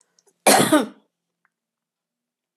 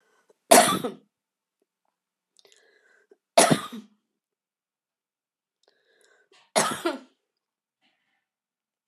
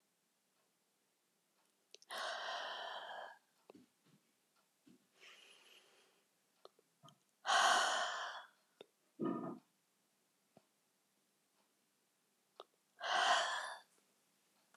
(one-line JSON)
{"cough_length": "2.6 s", "cough_amplitude": 30650, "cough_signal_mean_std_ratio": 0.29, "three_cough_length": "8.9 s", "three_cough_amplitude": 29903, "three_cough_signal_mean_std_ratio": 0.22, "exhalation_length": "14.8 s", "exhalation_amplitude": 3175, "exhalation_signal_mean_std_ratio": 0.34, "survey_phase": "beta (2021-08-13 to 2022-03-07)", "age": "65+", "gender": "Female", "wearing_mask": "No", "symptom_none": true, "smoker_status": "Never smoked", "respiratory_condition_asthma": false, "respiratory_condition_other": false, "recruitment_source": "REACT", "submission_delay": "2 days", "covid_test_result": "Negative", "covid_test_method": "RT-qPCR"}